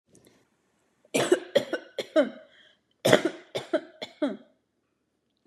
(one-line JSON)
{"cough_length": "5.5 s", "cough_amplitude": 27574, "cough_signal_mean_std_ratio": 0.33, "survey_phase": "beta (2021-08-13 to 2022-03-07)", "age": "45-64", "gender": "Female", "wearing_mask": "No", "symptom_cough_any": true, "symptom_headache": true, "symptom_onset": "1 day", "smoker_status": "Prefer not to say", "respiratory_condition_asthma": false, "respiratory_condition_other": false, "recruitment_source": "Test and Trace", "submission_delay": "1 day", "covid_test_result": "Positive", "covid_test_method": "RT-qPCR", "covid_ct_value": 22.1, "covid_ct_gene": "ORF1ab gene", "covid_ct_mean": 23.1, "covid_viral_load": "27000 copies/ml", "covid_viral_load_category": "Low viral load (10K-1M copies/ml)"}